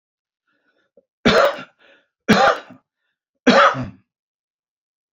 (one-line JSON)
{"three_cough_length": "5.1 s", "three_cough_amplitude": 32220, "three_cough_signal_mean_std_ratio": 0.34, "survey_phase": "beta (2021-08-13 to 2022-03-07)", "age": "65+", "gender": "Male", "wearing_mask": "No", "symptom_none": true, "smoker_status": "Ex-smoker", "respiratory_condition_asthma": false, "respiratory_condition_other": false, "recruitment_source": "REACT", "submission_delay": "1 day", "covid_test_result": "Negative", "covid_test_method": "RT-qPCR", "influenza_a_test_result": "Negative", "influenza_b_test_result": "Negative"}